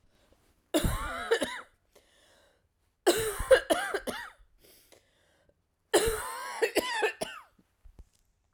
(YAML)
three_cough_length: 8.5 s
three_cough_amplitude: 12574
three_cough_signal_mean_std_ratio: 0.4
survey_phase: alpha (2021-03-01 to 2021-08-12)
age: 45-64
gender: Female
wearing_mask: 'No'
symptom_cough_any: true
symptom_new_continuous_cough: true
symptom_shortness_of_breath: true
symptom_fatigue: true
symptom_headache: true
smoker_status: Never smoked
respiratory_condition_asthma: false
respiratory_condition_other: false
recruitment_source: Test and Trace
submission_delay: 1 day
covid_test_result: Positive
covid_test_method: RT-qPCR
covid_ct_value: 32.3
covid_ct_gene: N gene